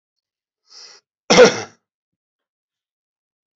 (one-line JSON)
{"cough_length": "3.6 s", "cough_amplitude": 30340, "cough_signal_mean_std_ratio": 0.22, "survey_phase": "beta (2021-08-13 to 2022-03-07)", "age": "65+", "gender": "Male", "wearing_mask": "No", "symptom_none": true, "smoker_status": "Never smoked", "respiratory_condition_asthma": false, "respiratory_condition_other": false, "recruitment_source": "REACT", "submission_delay": "2 days", "covid_test_result": "Negative", "covid_test_method": "RT-qPCR"}